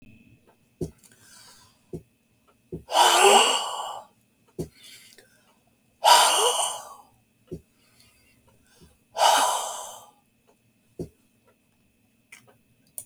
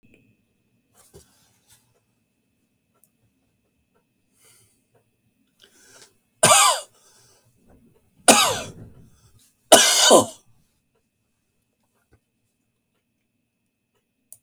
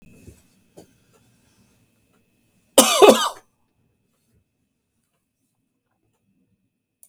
{"exhalation_length": "13.1 s", "exhalation_amplitude": 23752, "exhalation_signal_mean_std_ratio": 0.34, "three_cough_length": "14.4 s", "three_cough_amplitude": 32768, "three_cough_signal_mean_std_ratio": 0.22, "cough_length": "7.1 s", "cough_amplitude": 32767, "cough_signal_mean_std_ratio": 0.19, "survey_phase": "beta (2021-08-13 to 2022-03-07)", "age": "65+", "gender": "Male", "wearing_mask": "No", "symptom_none": true, "smoker_status": "Never smoked", "respiratory_condition_asthma": true, "respiratory_condition_other": false, "recruitment_source": "REACT", "submission_delay": "2 days", "covid_test_result": "Negative", "covid_test_method": "RT-qPCR", "influenza_a_test_result": "Negative", "influenza_b_test_result": "Negative"}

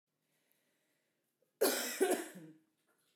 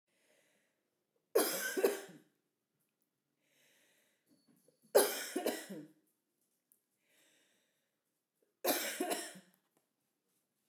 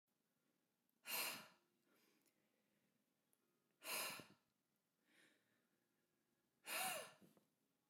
{"cough_length": "3.2 s", "cough_amplitude": 4069, "cough_signal_mean_std_ratio": 0.35, "three_cough_length": "10.7 s", "three_cough_amplitude": 6258, "three_cough_signal_mean_std_ratio": 0.29, "exhalation_length": "7.9 s", "exhalation_amplitude": 824, "exhalation_signal_mean_std_ratio": 0.33, "survey_phase": "beta (2021-08-13 to 2022-03-07)", "age": "18-44", "gender": "Female", "wearing_mask": "No", "symptom_runny_or_blocked_nose": true, "symptom_sore_throat": true, "symptom_fatigue": true, "symptom_headache": true, "symptom_change_to_sense_of_smell_or_taste": true, "symptom_loss_of_taste": true, "symptom_onset": "4 days", "smoker_status": "Never smoked", "respiratory_condition_asthma": true, "respiratory_condition_other": false, "recruitment_source": "Test and Trace", "submission_delay": "1 day", "covid_test_result": "Positive", "covid_test_method": "RT-qPCR"}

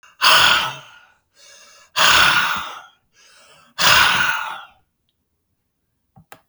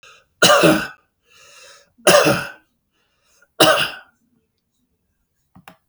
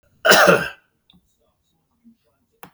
{"exhalation_length": "6.5 s", "exhalation_amplitude": 32768, "exhalation_signal_mean_std_ratio": 0.45, "three_cough_length": "5.9 s", "three_cough_amplitude": 32768, "three_cough_signal_mean_std_ratio": 0.35, "cough_length": "2.7 s", "cough_amplitude": 32766, "cough_signal_mean_std_ratio": 0.31, "survey_phase": "beta (2021-08-13 to 2022-03-07)", "age": "65+", "gender": "Male", "wearing_mask": "No", "symptom_none": true, "smoker_status": "Ex-smoker", "respiratory_condition_asthma": false, "respiratory_condition_other": false, "recruitment_source": "REACT", "submission_delay": "2 days", "covid_test_result": "Negative", "covid_test_method": "RT-qPCR", "influenza_a_test_result": "Negative", "influenza_b_test_result": "Negative"}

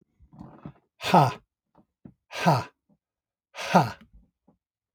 {"exhalation_length": "4.9 s", "exhalation_amplitude": 18080, "exhalation_signal_mean_std_ratio": 0.3, "survey_phase": "alpha (2021-03-01 to 2021-08-12)", "age": "45-64", "gender": "Male", "wearing_mask": "No", "symptom_none": true, "smoker_status": "Ex-smoker", "respiratory_condition_asthma": false, "respiratory_condition_other": false, "recruitment_source": "REACT", "submission_delay": "2 days", "covid_test_result": "Negative", "covid_test_method": "RT-qPCR"}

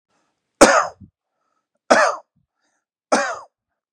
{"three_cough_length": "3.9 s", "three_cough_amplitude": 32768, "three_cough_signal_mean_std_ratio": 0.31, "survey_phase": "beta (2021-08-13 to 2022-03-07)", "age": "18-44", "gender": "Male", "wearing_mask": "No", "symptom_none": true, "smoker_status": "Never smoked", "respiratory_condition_asthma": false, "respiratory_condition_other": false, "recruitment_source": "REACT", "submission_delay": "2 days", "covid_test_result": "Negative", "covid_test_method": "RT-qPCR", "influenza_a_test_result": "Negative", "influenza_b_test_result": "Negative"}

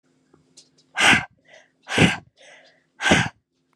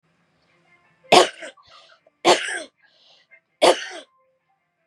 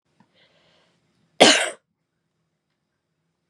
{"exhalation_length": "3.8 s", "exhalation_amplitude": 27531, "exhalation_signal_mean_std_ratio": 0.35, "three_cough_length": "4.9 s", "three_cough_amplitude": 32755, "three_cough_signal_mean_std_ratio": 0.27, "cough_length": "3.5 s", "cough_amplitude": 32767, "cough_signal_mean_std_ratio": 0.2, "survey_phase": "beta (2021-08-13 to 2022-03-07)", "age": "18-44", "gender": "Female", "wearing_mask": "No", "symptom_none": true, "symptom_onset": "13 days", "smoker_status": "Ex-smoker", "respiratory_condition_asthma": true, "respiratory_condition_other": false, "recruitment_source": "REACT", "submission_delay": "2 days", "covid_test_result": "Negative", "covid_test_method": "RT-qPCR", "influenza_a_test_result": "Negative", "influenza_b_test_result": "Negative"}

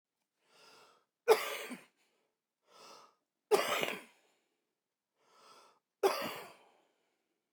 {"three_cough_length": "7.5 s", "three_cough_amplitude": 8470, "three_cough_signal_mean_std_ratio": 0.27, "survey_phase": "beta (2021-08-13 to 2022-03-07)", "age": "65+", "gender": "Male", "wearing_mask": "No", "symptom_none": true, "smoker_status": "Ex-smoker", "respiratory_condition_asthma": true, "respiratory_condition_other": false, "recruitment_source": "REACT", "submission_delay": "1 day", "covid_test_result": "Negative", "covid_test_method": "RT-qPCR"}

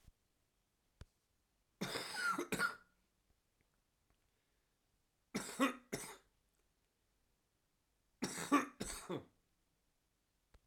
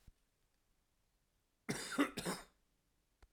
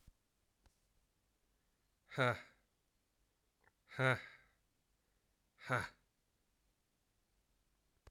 {"three_cough_length": "10.7 s", "three_cough_amplitude": 3778, "three_cough_signal_mean_std_ratio": 0.31, "cough_length": "3.3 s", "cough_amplitude": 3092, "cough_signal_mean_std_ratio": 0.31, "exhalation_length": "8.1 s", "exhalation_amplitude": 3228, "exhalation_signal_mean_std_ratio": 0.23, "survey_phase": "beta (2021-08-13 to 2022-03-07)", "age": "18-44", "gender": "Male", "wearing_mask": "No", "symptom_cough_any": true, "symptom_sore_throat": true, "symptom_onset": "3 days", "smoker_status": "Never smoked", "respiratory_condition_asthma": false, "respiratory_condition_other": false, "recruitment_source": "Test and Trace", "submission_delay": "2 days", "covid_test_result": "Positive", "covid_test_method": "RT-qPCR", "covid_ct_value": 34.5, "covid_ct_gene": "ORF1ab gene"}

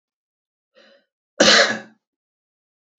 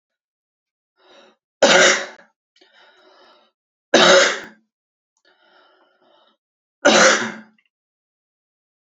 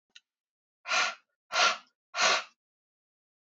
{"cough_length": "3.0 s", "cough_amplitude": 32429, "cough_signal_mean_std_ratio": 0.27, "three_cough_length": "9.0 s", "three_cough_amplitude": 31797, "three_cough_signal_mean_std_ratio": 0.3, "exhalation_length": "3.6 s", "exhalation_amplitude": 8369, "exhalation_signal_mean_std_ratio": 0.36, "survey_phase": "alpha (2021-03-01 to 2021-08-12)", "age": "18-44", "gender": "Male", "wearing_mask": "No", "symptom_cough_any": true, "smoker_status": "Never smoked", "respiratory_condition_asthma": false, "respiratory_condition_other": false, "recruitment_source": "REACT", "submission_delay": "1 day", "covid_test_result": "Negative", "covid_test_method": "RT-qPCR"}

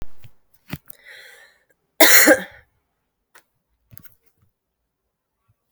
{"cough_length": "5.7 s", "cough_amplitude": 32768, "cough_signal_mean_std_ratio": 0.24, "survey_phase": "alpha (2021-03-01 to 2021-08-12)", "age": "18-44", "gender": "Female", "wearing_mask": "No", "symptom_cough_any": true, "symptom_shortness_of_breath": true, "symptom_fatigue": true, "symptom_headache": true, "smoker_status": "Ex-smoker", "respiratory_condition_asthma": false, "respiratory_condition_other": false, "recruitment_source": "Test and Trace", "submission_delay": "2 days", "covid_test_result": "Positive", "covid_test_method": "RT-qPCR", "covid_ct_value": 21.2, "covid_ct_gene": "ORF1ab gene", "covid_ct_mean": 21.6, "covid_viral_load": "83000 copies/ml", "covid_viral_load_category": "Low viral load (10K-1M copies/ml)"}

